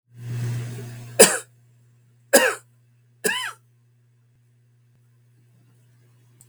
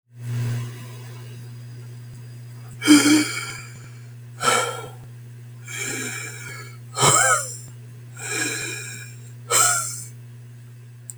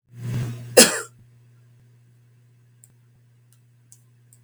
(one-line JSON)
{"three_cough_length": "6.5 s", "three_cough_amplitude": 32768, "three_cough_signal_mean_std_ratio": 0.29, "exhalation_length": "11.2 s", "exhalation_amplitude": 31098, "exhalation_signal_mean_std_ratio": 0.54, "cough_length": "4.4 s", "cough_amplitude": 32768, "cough_signal_mean_std_ratio": 0.23, "survey_phase": "beta (2021-08-13 to 2022-03-07)", "age": "65+", "gender": "Male", "wearing_mask": "No", "symptom_none": true, "smoker_status": "Never smoked", "respiratory_condition_asthma": false, "respiratory_condition_other": false, "recruitment_source": "REACT", "submission_delay": "2 days", "covid_test_result": "Negative", "covid_test_method": "RT-qPCR", "influenza_a_test_result": "Negative", "influenza_b_test_result": "Negative"}